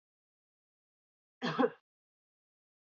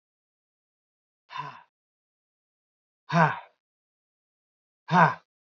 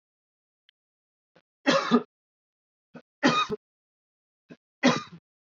{"cough_length": "2.9 s", "cough_amplitude": 4422, "cough_signal_mean_std_ratio": 0.21, "exhalation_length": "5.5 s", "exhalation_amplitude": 17650, "exhalation_signal_mean_std_ratio": 0.23, "three_cough_length": "5.5 s", "three_cough_amplitude": 14304, "three_cough_signal_mean_std_ratio": 0.29, "survey_phase": "beta (2021-08-13 to 2022-03-07)", "age": "18-44", "gender": "Male", "wearing_mask": "No", "symptom_none": true, "smoker_status": "Never smoked", "respiratory_condition_asthma": false, "respiratory_condition_other": false, "recruitment_source": "REACT", "submission_delay": "0 days", "covid_test_result": "Negative", "covid_test_method": "RT-qPCR", "influenza_a_test_result": "Negative", "influenza_b_test_result": "Negative"}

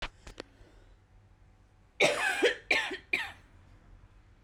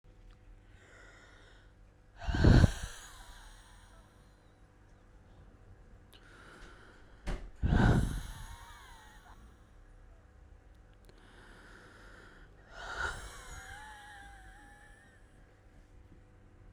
{"cough_length": "4.4 s", "cough_amplitude": 8755, "cough_signal_mean_std_ratio": 0.4, "exhalation_length": "16.7 s", "exhalation_amplitude": 12853, "exhalation_signal_mean_std_ratio": 0.3, "survey_phase": "beta (2021-08-13 to 2022-03-07)", "age": "18-44", "gender": "Female", "wearing_mask": "No", "symptom_cough_any": true, "symptom_runny_or_blocked_nose": true, "symptom_fatigue": true, "symptom_change_to_sense_of_smell_or_taste": true, "symptom_loss_of_taste": true, "symptom_other": true, "smoker_status": "Current smoker (1 to 10 cigarettes per day)", "respiratory_condition_asthma": false, "respiratory_condition_other": false, "recruitment_source": "Test and Trace", "submission_delay": "2 days", "covid_test_result": "Positive", "covid_test_method": "RT-qPCR"}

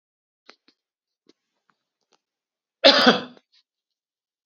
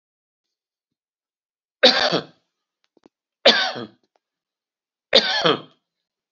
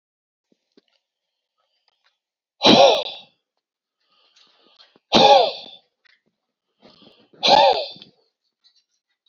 {"cough_length": "4.5 s", "cough_amplitude": 30979, "cough_signal_mean_std_ratio": 0.2, "three_cough_length": "6.3 s", "three_cough_amplitude": 32767, "three_cough_signal_mean_std_ratio": 0.29, "exhalation_length": "9.3 s", "exhalation_amplitude": 32768, "exhalation_signal_mean_std_ratio": 0.29, "survey_phase": "beta (2021-08-13 to 2022-03-07)", "age": "65+", "gender": "Male", "wearing_mask": "No", "symptom_none": true, "smoker_status": "Ex-smoker", "respiratory_condition_asthma": false, "respiratory_condition_other": false, "recruitment_source": "REACT", "submission_delay": "2 days", "covid_test_result": "Negative", "covid_test_method": "RT-qPCR"}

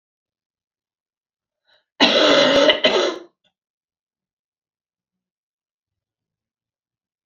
{"cough_length": "7.3 s", "cough_amplitude": 28533, "cough_signal_mean_std_ratio": 0.31, "survey_phase": "beta (2021-08-13 to 2022-03-07)", "age": "45-64", "gender": "Female", "wearing_mask": "No", "symptom_cough_any": true, "symptom_fatigue": true, "symptom_headache": true, "symptom_change_to_sense_of_smell_or_taste": true, "symptom_onset": "6 days", "smoker_status": "Never smoked", "respiratory_condition_asthma": true, "respiratory_condition_other": false, "recruitment_source": "Test and Trace", "submission_delay": "1 day", "covid_test_result": "Positive", "covid_test_method": "RT-qPCR", "covid_ct_value": 18.8, "covid_ct_gene": "ORF1ab gene", "covid_ct_mean": 19.4, "covid_viral_load": "440000 copies/ml", "covid_viral_load_category": "Low viral load (10K-1M copies/ml)"}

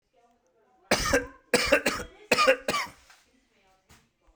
{"three_cough_length": "4.4 s", "three_cough_amplitude": 15571, "three_cough_signal_mean_std_ratio": 0.4, "survey_phase": "beta (2021-08-13 to 2022-03-07)", "age": "45-64", "gender": "Male", "wearing_mask": "No", "symptom_none": true, "smoker_status": "Never smoked", "respiratory_condition_asthma": false, "respiratory_condition_other": false, "recruitment_source": "REACT", "submission_delay": "4 days", "covid_test_result": "Negative", "covid_test_method": "RT-qPCR"}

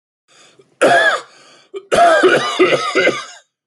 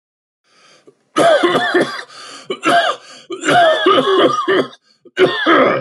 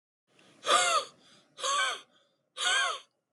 {"cough_length": "3.7 s", "cough_amplitude": 29037, "cough_signal_mean_std_ratio": 0.59, "three_cough_length": "5.8 s", "three_cough_amplitude": 27633, "three_cough_signal_mean_std_ratio": 0.67, "exhalation_length": "3.3 s", "exhalation_amplitude": 7638, "exhalation_signal_mean_std_ratio": 0.5, "survey_phase": "alpha (2021-03-01 to 2021-08-12)", "age": "18-44", "gender": "Male", "wearing_mask": "No", "symptom_none": true, "smoker_status": "Ex-smoker", "respiratory_condition_asthma": false, "respiratory_condition_other": true, "recruitment_source": "REACT", "submission_delay": "1 day", "covid_test_result": "Negative", "covid_test_method": "RT-qPCR"}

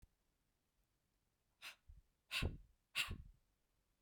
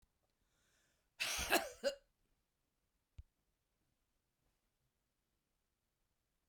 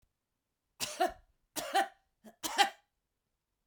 {"exhalation_length": "4.0 s", "exhalation_amplitude": 1805, "exhalation_signal_mean_std_ratio": 0.3, "cough_length": "6.5 s", "cough_amplitude": 3769, "cough_signal_mean_std_ratio": 0.22, "three_cough_length": "3.7 s", "three_cough_amplitude": 9697, "three_cough_signal_mean_std_ratio": 0.31, "survey_phase": "beta (2021-08-13 to 2022-03-07)", "age": "45-64", "gender": "Female", "wearing_mask": "No", "symptom_none": true, "smoker_status": "Ex-smoker", "respiratory_condition_asthma": false, "respiratory_condition_other": false, "recruitment_source": "REACT", "submission_delay": "2 days", "covid_test_result": "Negative", "covid_test_method": "RT-qPCR", "influenza_a_test_result": "Unknown/Void", "influenza_b_test_result": "Unknown/Void"}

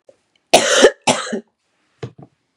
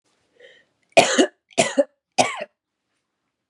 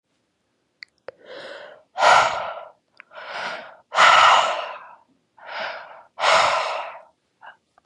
{"cough_length": "2.6 s", "cough_amplitude": 32768, "cough_signal_mean_std_ratio": 0.36, "three_cough_length": "3.5 s", "three_cough_amplitude": 32767, "three_cough_signal_mean_std_ratio": 0.31, "exhalation_length": "7.9 s", "exhalation_amplitude": 29883, "exhalation_signal_mean_std_ratio": 0.42, "survey_phase": "beta (2021-08-13 to 2022-03-07)", "age": "18-44", "gender": "Female", "wearing_mask": "No", "symptom_none": true, "smoker_status": "Current smoker (11 or more cigarettes per day)", "respiratory_condition_asthma": false, "respiratory_condition_other": false, "recruitment_source": "REACT", "submission_delay": "6 days", "covid_test_result": "Negative", "covid_test_method": "RT-qPCR", "influenza_a_test_result": "Negative", "influenza_b_test_result": "Negative"}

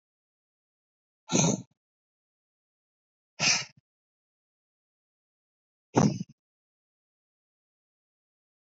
{"exhalation_length": "8.8 s", "exhalation_amplitude": 11751, "exhalation_signal_mean_std_ratio": 0.22, "survey_phase": "beta (2021-08-13 to 2022-03-07)", "age": "18-44", "gender": "Male", "wearing_mask": "No", "symptom_none": true, "smoker_status": "Current smoker (e-cigarettes or vapes only)", "respiratory_condition_asthma": false, "respiratory_condition_other": false, "recruitment_source": "REACT", "submission_delay": "2 days", "covid_test_result": "Negative", "covid_test_method": "RT-qPCR", "influenza_a_test_result": "Negative", "influenza_b_test_result": "Negative"}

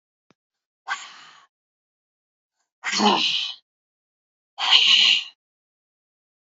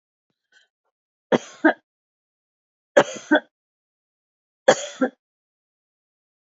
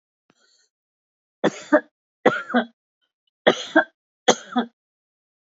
{"exhalation_length": "6.5 s", "exhalation_amplitude": 27569, "exhalation_signal_mean_std_ratio": 0.35, "three_cough_length": "6.5 s", "three_cough_amplitude": 26974, "three_cough_signal_mean_std_ratio": 0.21, "cough_length": "5.5 s", "cough_amplitude": 26579, "cough_signal_mean_std_ratio": 0.28, "survey_phase": "beta (2021-08-13 to 2022-03-07)", "age": "65+", "gender": "Female", "wearing_mask": "No", "symptom_none": true, "smoker_status": "Never smoked", "respiratory_condition_asthma": false, "respiratory_condition_other": false, "recruitment_source": "REACT", "submission_delay": "1 day", "covid_test_result": "Negative", "covid_test_method": "RT-qPCR", "influenza_a_test_result": "Negative", "influenza_b_test_result": "Negative"}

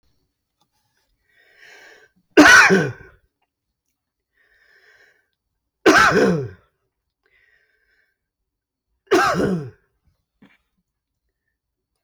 {"three_cough_length": "12.0 s", "three_cough_amplitude": 32768, "three_cough_signal_mean_std_ratio": 0.29, "survey_phase": "beta (2021-08-13 to 2022-03-07)", "age": "45-64", "gender": "Male", "wearing_mask": "No", "symptom_none": true, "smoker_status": "Ex-smoker", "respiratory_condition_asthma": false, "respiratory_condition_other": false, "recruitment_source": "REACT", "submission_delay": "1 day", "covid_test_result": "Negative", "covid_test_method": "RT-qPCR", "influenza_a_test_result": "Negative", "influenza_b_test_result": "Negative"}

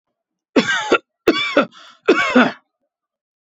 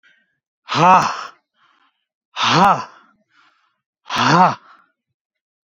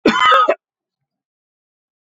{"three_cough_length": "3.6 s", "three_cough_amplitude": 28192, "three_cough_signal_mean_std_ratio": 0.43, "exhalation_length": "5.6 s", "exhalation_amplitude": 27959, "exhalation_signal_mean_std_ratio": 0.38, "cough_length": "2.0 s", "cough_amplitude": 27610, "cough_signal_mean_std_ratio": 0.4, "survey_phase": "beta (2021-08-13 to 2022-03-07)", "age": "18-44", "gender": "Male", "wearing_mask": "No", "symptom_none": true, "smoker_status": "Never smoked", "respiratory_condition_asthma": true, "respiratory_condition_other": false, "recruitment_source": "REACT", "submission_delay": "1 day", "covid_test_result": "Negative", "covid_test_method": "RT-qPCR"}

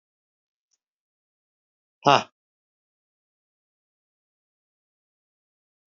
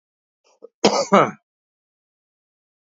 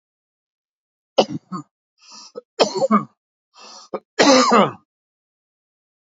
{"exhalation_length": "5.9 s", "exhalation_amplitude": 28260, "exhalation_signal_mean_std_ratio": 0.1, "cough_length": "2.9 s", "cough_amplitude": 26862, "cough_signal_mean_std_ratio": 0.27, "three_cough_length": "6.1 s", "three_cough_amplitude": 29539, "three_cough_signal_mean_std_ratio": 0.33, "survey_phase": "beta (2021-08-13 to 2022-03-07)", "age": "18-44", "gender": "Male", "wearing_mask": "No", "symptom_none": true, "smoker_status": "Ex-smoker", "respiratory_condition_asthma": false, "respiratory_condition_other": false, "recruitment_source": "REACT", "submission_delay": "2 days", "covid_test_result": "Negative", "covid_test_method": "RT-qPCR", "influenza_a_test_result": "Negative", "influenza_b_test_result": "Negative"}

